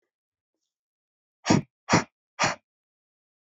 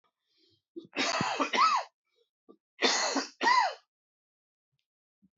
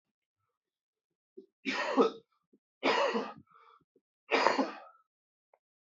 exhalation_length: 3.4 s
exhalation_amplitude: 18388
exhalation_signal_mean_std_ratio: 0.25
cough_length: 5.4 s
cough_amplitude: 9768
cough_signal_mean_std_ratio: 0.44
three_cough_length: 5.9 s
three_cough_amplitude: 15464
three_cough_signal_mean_std_ratio: 0.36
survey_phase: alpha (2021-03-01 to 2021-08-12)
age: 18-44
gender: Male
wearing_mask: 'No'
symptom_cough_any: true
symptom_fatigue: true
symptom_loss_of_taste: true
smoker_status: Ex-smoker
respiratory_condition_asthma: false
respiratory_condition_other: false
recruitment_source: Test and Trace
submission_delay: 3 days
covid_test_result: Positive
covid_test_method: LFT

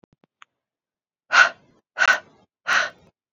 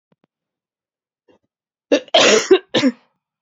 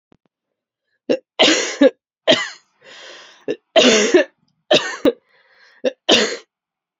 exhalation_length: 3.3 s
exhalation_amplitude: 26994
exhalation_signal_mean_std_ratio: 0.31
cough_length: 3.4 s
cough_amplitude: 30644
cough_signal_mean_std_ratio: 0.34
three_cough_length: 7.0 s
three_cough_amplitude: 32136
three_cough_signal_mean_std_ratio: 0.4
survey_phase: beta (2021-08-13 to 2022-03-07)
age: 18-44
gender: Female
wearing_mask: 'No'
symptom_cough_any: true
symptom_runny_or_blocked_nose: true
symptom_headache: true
symptom_other: true
symptom_onset: 11 days
smoker_status: Never smoked
respiratory_condition_asthma: false
respiratory_condition_other: false
recruitment_source: Test and Trace
submission_delay: 2 days
covid_test_result: Positive
covid_test_method: RT-qPCR
covid_ct_value: 22.4
covid_ct_gene: ORF1ab gene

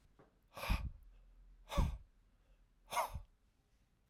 exhalation_length: 4.1 s
exhalation_amplitude: 2635
exhalation_signal_mean_std_ratio: 0.38
survey_phase: alpha (2021-03-01 to 2021-08-12)
age: 45-64
gender: Male
wearing_mask: 'No'
symptom_none: true
smoker_status: Never smoked
respiratory_condition_asthma: false
respiratory_condition_other: false
recruitment_source: REACT
submission_delay: 1 day
covid_test_result: Negative
covid_test_method: RT-qPCR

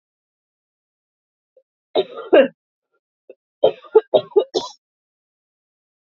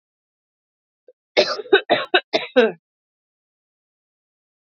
three_cough_length: 6.1 s
three_cough_amplitude: 28221
three_cough_signal_mean_std_ratio: 0.24
cough_length: 4.7 s
cough_amplitude: 28820
cough_signal_mean_std_ratio: 0.28
survey_phase: beta (2021-08-13 to 2022-03-07)
age: 18-44
gender: Female
wearing_mask: 'No'
symptom_runny_or_blocked_nose: true
symptom_sore_throat: true
symptom_onset: 9 days
smoker_status: Never smoked
respiratory_condition_asthma: false
respiratory_condition_other: false
recruitment_source: REACT
submission_delay: 2 days
covid_test_result: Negative
covid_test_method: RT-qPCR
influenza_a_test_result: Negative
influenza_b_test_result: Negative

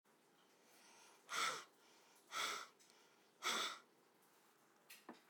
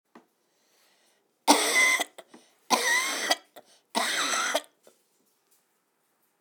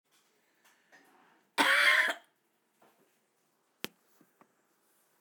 exhalation_length: 5.3 s
exhalation_amplitude: 1402
exhalation_signal_mean_std_ratio: 0.41
three_cough_length: 6.4 s
three_cough_amplitude: 19765
three_cough_signal_mean_std_ratio: 0.42
cough_length: 5.2 s
cough_amplitude: 10067
cough_signal_mean_std_ratio: 0.28
survey_phase: beta (2021-08-13 to 2022-03-07)
age: 18-44
gender: Male
wearing_mask: 'No'
symptom_cough_any: true
symptom_runny_or_blocked_nose: true
symptom_shortness_of_breath: true
symptom_sore_throat: true
symptom_abdominal_pain: true
symptom_diarrhoea: true
symptom_fatigue: true
symptom_headache: true
symptom_change_to_sense_of_smell_or_taste: true
symptom_loss_of_taste: true
symptom_onset: 4 days
smoker_status: Current smoker (1 to 10 cigarettes per day)
respiratory_condition_asthma: false
respiratory_condition_other: false
recruitment_source: Test and Trace
submission_delay: 2 days
covid_test_result: Positive
covid_test_method: RT-qPCR
covid_ct_value: 18.3
covid_ct_gene: ORF1ab gene
covid_ct_mean: 19.4
covid_viral_load: 440000 copies/ml
covid_viral_load_category: Low viral load (10K-1M copies/ml)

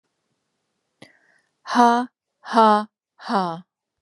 exhalation_length: 4.0 s
exhalation_amplitude: 29882
exhalation_signal_mean_std_ratio: 0.36
survey_phase: beta (2021-08-13 to 2022-03-07)
age: 45-64
gender: Female
wearing_mask: 'No'
symptom_sore_throat: true
smoker_status: Ex-smoker
respiratory_condition_asthma: true
respiratory_condition_other: false
recruitment_source: REACT
submission_delay: 2 days
covid_test_result: Negative
covid_test_method: RT-qPCR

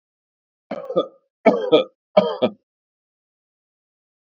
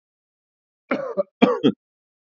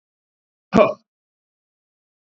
three_cough_length: 4.4 s
three_cough_amplitude: 27608
three_cough_signal_mean_std_ratio: 0.3
cough_length: 2.3 s
cough_amplitude: 32768
cough_signal_mean_std_ratio: 0.32
exhalation_length: 2.2 s
exhalation_amplitude: 27302
exhalation_signal_mean_std_ratio: 0.2
survey_phase: beta (2021-08-13 to 2022-03-07)
age: 45-64
gender: Male
wearing_mask: 'No'
symptom_sore_throat: true
smoker_status: Never smoked
respiratory_condition_asthma: false
respiratory_condition_other: false
recruitment_source: REACT
submission_delay: 0 days
covid_test_result: Negative
covid_test_method: RT-qPCR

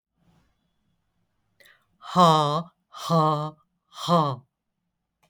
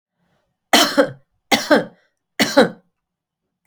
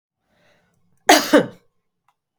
exhalation_length: 5.3 s
exhalation_amplitude: 20875
exhalation_signal_mean_std_ratio: 0.38
three_cough_length: 3.7 s
three_cough_amplitude: 32768
three_cough_signal_mean_std_ratio: 0.35
cough_length: 2.4 s
cough_amplitude: 32768
cough_signal_mean_std_ratio: 0.26
survey_phase: beta (2021-08-13 to 2022-03-07)
age: 45-64
gender: Female
wearing_mask: 'No'
symptom_none: true
symptom_onset: 12 days
smoker_status: Never smoked
respiratory_condition_asthma: false
respiratory_condition_other: false
recruitment_source: REACT
submission_delay: 1 day
covid_test_result: Negative
covid_test_method: RT-qPCR
influenza_a_test_result: Negative
influenza_b_test_result: Negative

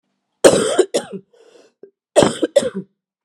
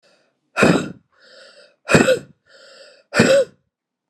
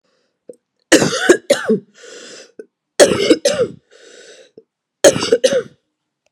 cough_length: 3.2 s
cough_amplitude: 32768
cough_signal_mean_std_ratio: 0.38
exhalation_length: 4.1 s
exhalation_amplitude: 32767
exhalation_signal_mean_std_ratio: 0.38
three_cough_length: 6.3 s
three_cough_amplitude: 32768
three_cough_signal_mean_std_ratio: 0.39
survey_phase: beta (2021-08-13 to 2022-03-07)
age: 45-64
gender: Female
wearing_mask: 'No'
symptom_cough_any: true
symptom_runny_or_blocked_nose: true
symptom_sore_throat: true
symptom_fatigue: true
symptom_headache: true
symptom_change_to_sense_of_smell_or_taste: true
symptom_other: true
symptom_onset: 3 days
smoker_status: Ex-smoker
respiratory_condition_asthma: false
respiratory_condition_other: false
recruitment_source: Test and Trace
submission_delay: 2 days
covid_test_result: Positive
covid_test_method: ePCR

